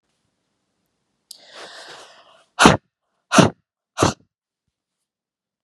exhalation_length: 5.6 s
exhalation_amplitude: 32768
exhalation_signal_mean_std_ratio: 0.22
survey_phase: beta (2021-08-13 to 2022-03-07)
age: 18-44
gender: Female
wearing_mask: 'No'
symptom_none: true
smoker_status: Never smoked
respiratory_condition_asthma: false
respiratory_condition_other: false
recruitment_source: REACT
submission_delay: 2 days
covid_test_result: Negative
covid_test_method: RT-qPCR
influenza_a_test_result: Negative
influenza_b_test_result: Negative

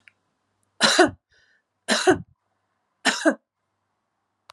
three_cough_length: 4.5 s
three_cough_amplitude: 26183
three_cough_signal_mean_std_ratio: 0.31
survey_phase: alpha (2021-03-01 to 2021-08-12)
age: 65+
gender: Female
wearing_mask: 'No'
symptom_diarrhoea: true
smoker_status: Ex-smoker
respiratory_condition_asthma: false
respiratory_condition_other: false
recruitment_source: Test and Trace
submission_delay: 1 day
covid_test_result: Positive
covid_test_method: RT-qPCR
covid_ct_value: 36.3
covid_ct_gene: ORF1ab gene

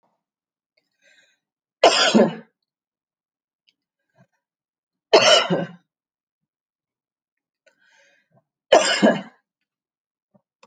three_cough_length: 10.7 s
three_cough_amplitude: 28789
three_cough_signal_mean_std_ratio: 0.27
survey_phase: beta (2021-08-13 to 2022-03-07)
age: 45-64
gender: Female
wearing_mask: 'No'
symptom_none: true
smoker_status: Never smoked
respiratory_condition_asthma: false
respiratory_condition_other: false
recruitment_source: REACT
submission_delay: 6 days
covid_test_result: Negative
covid_test_method: RT-qPCR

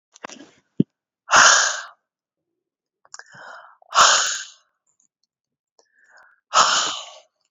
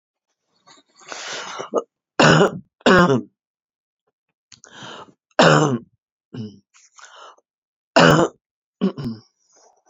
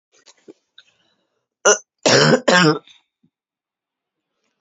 exhalation_length: 7.5 s
exhalation_amplitude: 32767
exhalation_signal_mean_std_ratio: 0.33
three_cough_length: 9.9 s
three_cough_amplitude: 32767
three_cough_signal_mean_std_ratio: 0.34
cough_length: 4.6 s
cough_amplitude: 29184
cough_signal_mean_std_ratio: 0.32
survey_phase: beta (2021-08-13 to 2022-03-07)
age: 65+
gender: Female
wearing_mask: 'No'
symptom_new_continuous_cough: true
symptom_fatigue: true
symptom_fever_high_temperature: true
symptom_headache: true
symptom_onset: 1 day
smoker_status: Never smoked
respiratory_condition_asthma: false
respiratory_condition_other: false
recruitment_source: Test and Trace
submission_delay: 1 day
covid_test_result: Positive
covid_test_method: RT-qPCR
covid_ct_value: 29.0
covid_ct_gene: N gene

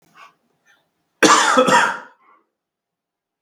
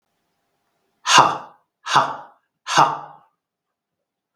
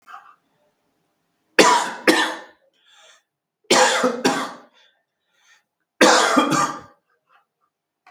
cough_length: 3.4 s
cough_amplitude: 32768
cough_signal_mean_std_ratio: 0.38
exhalation_length: 4.4 s
exhalation_amplitude: 32768
exhalation_signal_mean_std_ratio: 0.32
three_cough_length: 8.1 s
three_cough_amplitude: 32768
three_cough_signal_mean_std_ratio: 0.39
survey_phase: beta (2021-08-13 to 2022-03-07)
age: 45-64
gender: Male
wearing_mask: 'No'
symptom_none: true
smoker_status: Never smoked
respiratory_condition_asthma: false
respiratory_condition_other: false
recruitment_source: REACT
submission_delay: 14 days
covid_test_result: Negative
covid_test_method: RT-qPCR
influenza_a_test_result: Negative
influenza_b_test_result: Negative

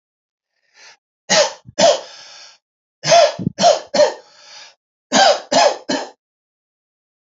three_cough_length: 7.3 s
three_cough_amplitude: 31366
three_cough_signal_mean_std_ratio: 0.41
survey_phase: alpha (2021-03-01 to 2021-08-12)
age: 45-64
gender: Male
wearing_mask: 'No'
symptom_none: true
smoker_status: Ex-smoker
respiratory_condition_asthma: false
respiratory_condition_other: false
recruitment_source: REACT
submission_delay: 2 days
covid_test_result: Negative
covid_test_method: RT-qPCR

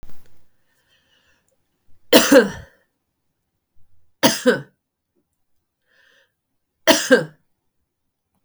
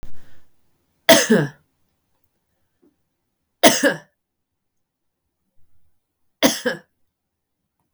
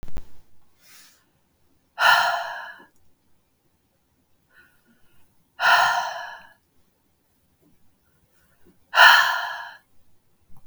three_cough_length: 8.4 s
three_cough_amplitude: 32768
three_cough_signal_mean_std_ratio: 0.27
cough_length: 7.9 s
cough_amplitude: 32768
cough_signal_mean_std_ratio: 0.27
exhalation_length: 10.7 s
exhalation_amplitude: 32402
exhalation_signal_mean_std_ratio: 0.33
survey_phase: beta (2021-08-13 to 2022-03-07)
age: 45-64
gender: Female
wearing_mask: 'No'
symptom_runny_or_blocked_nose: true
symptom_onset: 4 days
smoker_status: Never smoked
respiratory_condition_asthma: false
respiratory_condition_other: false
recruitment_source: REACT
submission_delay: 0 days
covid_test_result: Negative
covid_test_method: RT-qPCR
influenza_a_test_result: Negative
influenza_b_test_result: Negative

